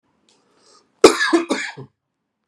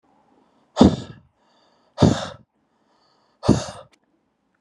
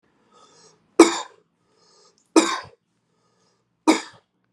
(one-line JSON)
{"cough_length": "2.5 s", "cough_amplitude": 32768, "cough_signal_mean_std_ratio": 0.3, "exhalation_length": "4.6 s", "exhalation_amplitude": 32768, "exhalation_signal_mean_std_ratio": 0.26, "three_cough_length": "4.5 s", "three_cough_amplitude": 32768, "three_cough_signal_mean_std_ratio": 0.23, "survey_phase": "beta (2021-08-13 to 2022-03-07)", "age": "18-44", "gender": "Male", "wearing_mask": "No", "symptom_fatigue": true, "symptom_change_to_sense_of_smell_or_taste": true, "symptom_loss_of_taste": true, "symptom_onset": "2 days", "smoker_status": "Never smoked", "respiratory_condition_asthma": false, "respiratory_condition_other": false, "recruitment_source": "Test and Trace", "submission_delay": "1 day", "covid_test_result": "Positive", "covid_test_method": "RT-qPCR", "covid_ct_value": 17.7, "covid_ct_gene": "ORF1ab gene", "covid_ct_mean": 18.4, "covid_viral_load": "950000 copies/ml", "covid_viral_load_category": "Low viral load (10K-1M copies/ml)"}